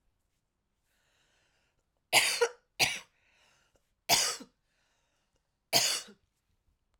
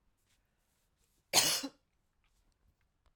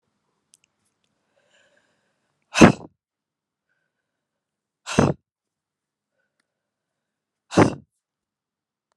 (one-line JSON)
{"three_cough_length": "7.0 s", "three_cough_amplitude": 12841, "three_cough_signal_mean_std_ratio": 0.29, "cough_length": "3.2 s", "cough_amplitude": 7365, "cough_signal_mean_std_ratio": 0.24, "exhalation_length": "9.0 s", "exhalation_amplitude": 32768, "exhalation_signal_mean_std_ratio": 0.16, "survey_phase": "alpha (2021-03-01 to 2021-08-12)", "age": "18-44", "gender": "Female", "wearing_mask": "No", "symptom_cough_any": true, "symptom_fatigue": true, "symptom_headache": true, "smoker_status": "Never smoked", "respiratory_condition_asthma": true, "respiratory_condition_other": false, "recruitment_source": "Test and Trace", "submission_delay": "2 days", "covid_test_result": "Positive", "covid_test_method": "RT-qPCR", "covid_ct_value": 12.6, "covid_ct_gene": "N gene", "covid_ct_mean": 13.1, "covid_viral_load": "51000000 copies/ml", "covid_viral_load_category": "High viral load (>1M copies/ml)"}